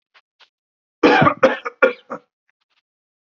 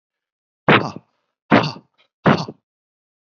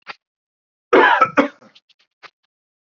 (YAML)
three_cough_length: 3.3 s
three_cough_amplitude: 29016
three_cough_signal_mean_std_ratio: 0.33
exhalation_length: 3.2 s
exhalation_amplitude: 29342
exhalation_signal_mean_std_ratio: 0.31
cough_length: 2.8 s
cough_amplitude: 28410
cough_signal_mean_std_ratio: 0.32
survey_phase: alpha (2021-03-01 to 2021-08-12)
age: 45-64
gender: Male
wearing_mask: 'No'
symptom_none: true
smoker_status: Never smoked
respiratory_condition_asthma: false
respiratory_condition_other: false
recruitment_source: REACT
submission_delay: 1 day
covid_test_result: Negative
covid_test_method: RT-qPCR